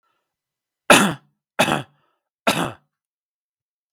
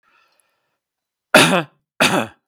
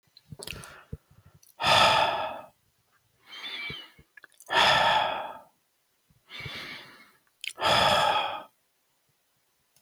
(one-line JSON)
{"three_cough_length": "3.9 s", "three_cough_amplitude": 32768, "three_cough_signal_mean_std_ratio": 0.28, "cough_length": "2.5 s", "cough_amplitude": 32768, "cough_signal_mean_std_ratio": 0.34, "exhalation_length": "9.8 s", "exhalation_amplitude": 14152, "exhalation_signal_mean_std_ratio": 0.44, "survey_phase": "beta (2021-08-13 to 2022-03-07)", "age": "45-64", "gender": "Male", "wearing_mask": "No", "symptom_none": true, "symptom_onset": "8 days", "smoker_status": "Ex-smoker", "respiratory_condition_asthma": false, "respiratory_condition_other": false, "recruitment_source": "REACT", "submission_delay": "1 day", "covid_test_result": "Negative", "covid_test_method": "RT-qPCR", "influenza_a_test_result": "Unknown/Void", "influenza_b_test_result": "Unknown/Void"}